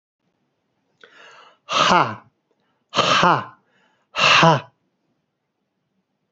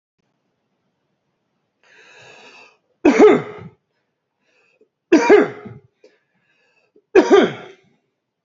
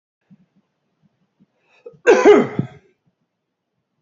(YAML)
exhalation_length: 6.3 s
exhalation_amplitude: 30101
exhalation_signal_mean_std_ratio: 0.35
three_cough_length: 8.4 s
three_cough_amplitude: 29414
three_cough_signal_mean_std_ratio: 0.29
cough_length: 4.0 s
cough_amplitude: 31829
cough_signal_mean_std_ratio: 0.27
survey_phase: beta (2021-08-13 to 2022-03-07)
age: 45-64
gender: Male
wearing_mask: 'No'
symptom_cough_any: true
symptom_runny_or_blocked_nose: true
symptom_sore_throat: true
symptom_fever_high_temperature: true
symptom_headache: true
symptom_onset: 2 days
smoker_status: Never smoked
respiratory_condition_asthma: false
respiratory_condition_other: false
recruitment_source: Test and Trace
submission_delay: 1 day
covid_test_result: Positive
covid_test_method: RT-qPCR